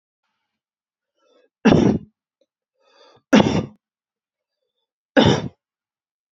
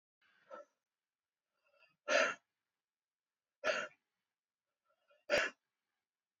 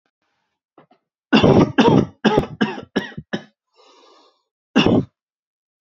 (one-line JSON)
{"three_cough_length": "6.3 s", "three_cough_amplitude": 27965, "three_cough_signal_mean_std_ratio": 0.29, "exhalation_length": "6.4 s", "exhalation_amplitude": 3616, "exhalation_signal_mean_std_ratio": 0.25, "cough_length": "5.8 s", "cough_amplitude": 27490, "cough_signal_mean_std_ratio": 0.39, "survey_phase": "beta (2021-08-13 to 2022-03-07)", "age": "18-44", "gender": "Male", "wearing_mask": "No", "symptom_cough_any": true, "symptom_new_continuous_cough": true, "symptom_runny_or_blocked_nose": true, "symptom_sore_throat": true, "symptom_fatigue": true, "symptom_headache": true, "symptom_onset": "3 days", "smoker_status": "Never smoked", "respiratory_condition_asthma": false, "respiratory_condition_other": false, "recruitment_source": "REACT", "submission_delay": "1 day", "covid_test_result": "Negative", "covid_test_method": "RT-qPCR", "influenza_a_test_result": "Negative", "influenza_b_test_result": "Negative"}